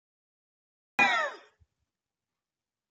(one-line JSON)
{"cough_length": "2.9 s", "cough_amplitude": 8830, "cough_signal_mean_std_ratio": 0.26, "survey_phase": "beta (2021-08-13 to 2022-03-07)", "age": "65+", "gender": "Female", "wearing_mask": "No", "symptom_none": true, "smoker_status": "Ex-smoker", "respiratory_condition_asthma": true, "respiratory_condition_other": false, "recruitment_source": "REACT", "submission_delay": "2 days", "covid_test_result": "Negative", "covid_test_method": "RT-qPCR", "influenza_a_test_result": "Negative", "influenza_b_test_result": "Negative"}